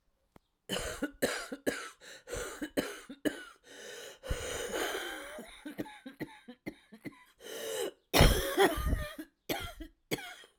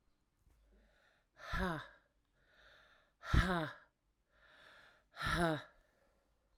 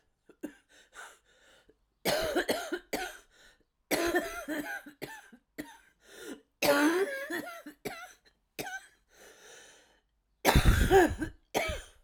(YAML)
cough_length: 10.6 s
cough_amplitude: 13112
cough_signal_mean_std_ratio: 0.46
exhalation_length: 6.6 s
exhalation_amplitude: 4297
exhalation_signal_mean_std_ratio: 0.34
three_cough_length: 12.0 s
three_cough_amplitude: 13865
three_cough_signal_mean_std_ratio: 0.42
survey_phase: alpha (2021-03-01 to 2021-08-12)
age: 45-64
gender: Female
wearing_mask: 'No'
symptom_cough_any: true
symptom_shortness_of_breath: true
symptom_fatigue: true
symptom_headache: true
symptom_change_to_sense_of_smell_or_taste: true
symptom_loss_of_taste: true
symptom_onset: 4 days
smoker_status: Current smoker (e-cigarettes or vapes only)
respiratory_condition_asthma: true
respiratory_condition_other: false
recruitment_source: Test and Trace
submission_delay: 2 days
covid_test_result: Positive
covid_test_method: RT-qPCR
covid_ct_value: 16.1
covid_ct_gene: ORF1ab gene
covid_ct_mean: 17.1
covid_viral_load: 2400000 copies/ml
covid_viral_load_category: High viral load (>1M copies/ml)